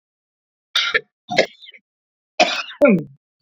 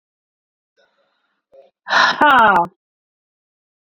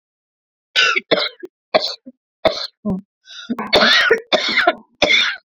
{
  "three_cough_length": "3.4 s",
  "three_cough_amplitude": 28920,
  "three_cough_signal_mean_std_ratio": 0.36,
  "exhalation_length": "3.8 s",
  "exhalation_amplitude": 28089,
  "exhalation_signal_mean_std_ratio": 0.35,
  "cough_length": "5.5 s",
  "cough_amplitude": 32767,
  "cough_signal_mean_std_ratio": 0.53,
  "survey_phase": "beta (2021-08-13 to 2022-03-07)",
  "age": "18-44",
  "gender": "Female",
  "wearing_mask": "No",
  "symptom_cough_any": true,
  "symptom_diarrhoea": true,
  "smoker_status": "Ex-smoker",
  "respiratory_condition_asthma": false,
  "respiratory_condition_other": false,
  "recruitment_source": "Test and Trace",
  "submission_delay": "1 day",
  "covid_test_result": "Positive",
  "covid_test_method": "RT-qPCR",
  "covid_ct_value": 30.9,
  "covid_ct_gene": "N gene"
}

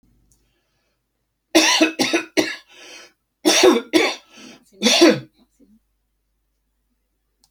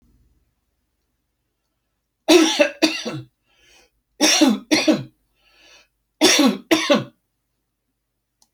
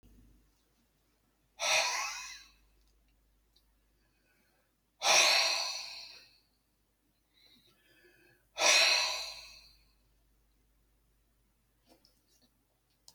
{
  "cough_length": "7.5 s",
  "cough_amplitude": 30768,
  "cough_signal_mean_std_ratio": 0.37,
  "three_cough_length": "8.5 s",
  "three_cough_amplitude": 30138,
  "three_cough_signal_mean_std_ratio": 0.38,
  "exhalation_length": "13.1 s",
  "exhalation_amplitude": 8084,
  "exhalation_signal_mean_std_ratio": 0.32,
  "survey_phase": "alpha (2021-03-01 to 2021-08-12)",
  "age": "65+",
  "gender": "Male",
  "wearing_mask": "No",
  "symptom_none": true,
  "smoker_status": "Ex-smoker",
  "respiratory_condition_asthma": false,
  "respiratory_condition_other": false,
  "recruitment_source": "REACT",
  "submission_delay": "3 days",
  "covid_test_result": "Negative",
  "covid_test_method": "RT-qPCR"
}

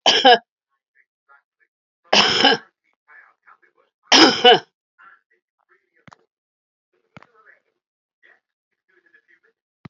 {
  "three_cough_length": "9.9 s",
  "three_cough_amplitude": 31316,
  "three_cough_signal_mean_std_ratio": 0.26,
  "survey_phase": "beta (2021-08-13 to 2022-03-07)",
  "age": "65+",
  "gender": "Female",
  "wearing_mask": "No",
  "symptom_cough_any": true,
  "symptom_shortness_of_breath": true,
  "symptom_fatigue": true,
  "symptom_fever_high_temperature": true,
  "symptom_loss_of_taste": true,
  "symptom_onset": "5 days",
  "smoker_status": "Ex-smoker",
  "respiratory_condition_asthma": true,
  "respiratory_condition_other": false,
  "recruitment_source": "Test and Trace",
  "submission_delay": "1 day",
  "covid_test_result": "Positive",
  "covid_test_method": "RT-qPCR"
}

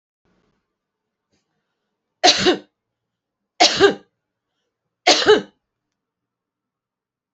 {
  "three_cough_length": "7.3 s",
  "three_cough_amplitude": 32768,
  "three_cough_signal_mean_std_ratio": 0.27,
  "survey_phase": "beta (2021-08-13 to 2022-03-07)",
  "age": "45-64",
  "gender": "Female",
  "wearing_mask": "No",
  "symptom_none": true,
  "smoker_status": "Never smoked",
  "respiratory_condition_asthma": false,
  "respiratory_condition_other": false,
  "recruitment_source": "REACT",
  "submission_delay": "2 days",
  "covid_test_result": "Negative",
  "covid_test_method": "RT-qPCR"
}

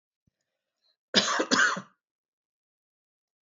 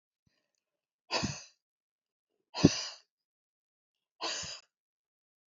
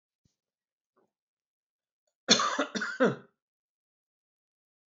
{
  "cough_length": "3.4 s",
  "cough_amplitude": 14390,
  "cough_signal_mean_std_ratio": 0.31,
  "exhalation_length": "5.5 s",
  "exhalation_amplitude": 16354,
  "exhalation_signal_mean_std_ratio": 0.22,
  "three_cough_length": "4.9 s",
  "three_cough_amplitude": 19741,
  "three_cough_signal_mean_std_ratio": 0.26,
  "survey_phase": "alpha (2021-03-01 to 2021-08-12)",
  "age": "65+",
  "gender": "Female",
  "wearing_mask": "No",
  "symptom_none": true,
  "smoker_status": "Ex-smoker",
  "respiratory_condition_asthma": false,
  "respiratory_condition_other": false,
  "recruitment_source": "REACT",
  "submission_delay": "2 days",
  "covid_test_result": "Negative",
  "covid_test_method": "RT-qPCR"
}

